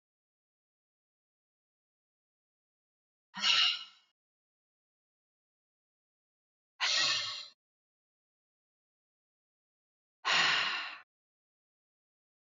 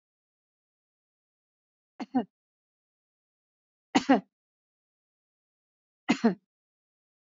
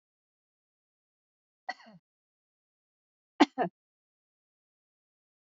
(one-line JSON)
{"exhalation_length": "12.5 s", "exhalation_amplitude": 6503, "exhalation_signal_mean_std_ratio": 0.28, "three_cough_length": "7.3 s", "three_cough_amplitude": 13950, "three_cough_signal_mean_std_ratio": 0.18, "cough_length": "5.5 s", "cough_amplitude": 13437, "cough_signal_mean_std_ratio": 0.11, "survey_phase": "beta (2021-08-13 to 2022-03-07)", "age": "45-64", "gender": "Female", "wearing_mask": "No", "symptom_none": true, "smoker_status": "Never smoked", "respiratory_condition_asthma": false, "respiratory_condition_other": false, "recruitment_source": "REACT", "submission_delay": "3 days", "covid_test_result": "Negative", "covid_test_method": "RT-qPCR", "influenza_a_test_result": "Negative", "influenza_b_test_result": "Negative"}